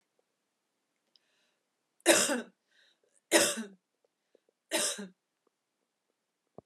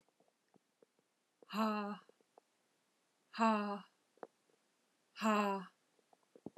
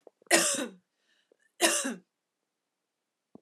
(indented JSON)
{
  "three_cough_length": "6.7 s",
  "three_cough_amplitude": 15399,
  "three_cough_signal_mean_std_ratio": 0.27,
  "exhalation_length": "6.6 s",
  "exhalation_amplitude": 3169,
  "exhalation_signal_mean_std_ratio": 0.35,
  "cough_length": "3.4 s",
  "cough_amplitude": 17094,
  "cough_signal_mean_std_ratio": 0.34,
  "survey_phase": "alpha (2021-03-01 to 2021-08-12)",
  "age": "45-64",
  "gender": "Female",
  "wearing_mask": "No",
  "symptom_none": true,
  "smoker_status": "Never smoked",
  "respiratory_condition_asthma": false,
  "respiratory_condition_other": false,
  "recruitment_source": "REACT",
  "submission_delay": "1 day",
  "covid_test_result": "Negative",
  "covid_test_method": "RT-qPCR"
}